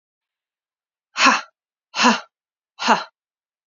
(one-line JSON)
{"exhalation_length": "3.7 s", "exhalation_amplitude": 29209, "exhalation_signal_mean_std_ratio": 0.31, "survey_phase": "beta (2021-08-13 to 2022-03-07)", "age": "18-44", "gender": "Female", "wearing_mask": "No", "symptom_cough_any": true, "symptom_runny_or_blocked_nose": true, "symptom_fatigue": true, "symptom_headache": true, "symptom_other": true, "symptom_onset": "5 days", "smoker_status": "Never smoked", "respiratory_condition_asthma": false, "respiratory_condition_other": false, "recruitment_source": "Test and Trace", "submission_delay": "2 days", "covid_test_result": "Positive", "covid_test_method": "RT-qPCR", "covid_ct_value": 17.6, "covid_ct_gene": "ORF1ab gene", "covid_ct_mean": 17.8, "covid_viral_load": "1400000 copies/ml", "covid_viral_load_category": "High viral load (>1M copies/ml)"}